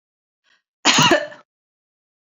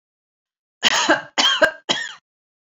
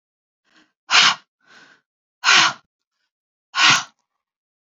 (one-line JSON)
{"cough_length": "2.2 s", "cough_amplitude": 30550, "cough_signal_mean_std_ratio": 0.33, "three_cough_length": "2.6 s", "three_cough_amplitude": 29036, "three_cough_signal_mean_std_ratio": 0.44, "exhalation_length": "4.6 s", "exhalation_amplitude": 31850, "exhalation_signal_mean_std_ratio": 0.33, "survey_phase": "beta (2021-08-13 to 2022-03-07)", "age": "45-64", "gender": "Female", "wearing_mask": "No", "symptom_none": true, "smoker_status": "Ex-smoker", "respiratory_condition_asthma": false, "respiratory_condition_other": false, "recruitment_source": "REACT", "submission_delay": "1 day", "covid_test_result": "Negative", "covid_test_method": "RT-qPCR"}